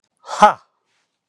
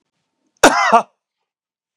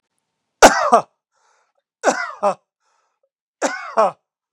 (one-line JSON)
{"exhalation_length": "1.3 s", "exhalation_amplitude": 32768, "exhalation_signal_mean_std_ratio": 0.25, "cough_length": "2.0 s", "cough_amplitude": 32768, "cough_signal_mean_std_ratio": 0.32, "three_cough_length": "4.5 s", "three_cough_amplitude": 32768, "three_cough_signal_mean_std_ratio": 0.31, "survey_phase": "beta (2021-08-13 to 2022-03-07)", "age": "65+", "gender": "Male", "wearing_mask": "No", "symptom_cough_any": true, "smoker_status": "Never smoked", "respiratory_condition_asthma": true, "respiratory_condition_other": false, "recruitment_source": "REACT", "submission_delay": "1 day", "covid_test_result": "Negative", "covid_test_method": "RT-qPCR"}